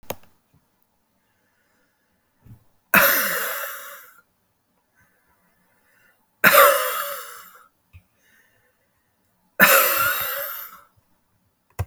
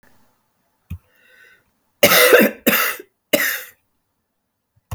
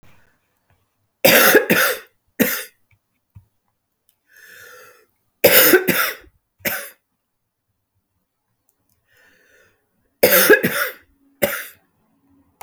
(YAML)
exhalation_length: 11.9 s
exhalation_amplitude: 32767
exhalation_signal_mean_std_ratio: 0.33
cough_length: 4.9 s
cough_amplitude: 32768
cough_signal_mean_std_ratio: 0.35
three_cough_length: 12.6 s
three_cough_amplitude: 32768
three_cough_signal_mean_std_ratio: 0.33
survey_phase: alpha (2021-03-01 to 2021-08-12)
age: 45-64
gender: Female
wearing_mask: 'No'
symptom_cough_any: true
symptom_shortness_of_breath: true
smoker_status: Ex-smoker
respiratory_condition_asthma: true
respiratory_condition_other: false
recruitment_source: Test and Trace
submission_delay: 1 day
covid_test_result: Positive
covid_test_method: RT-qPCR
covid_ct_value: 24.8
covid_ct_gene: ORF1ab gene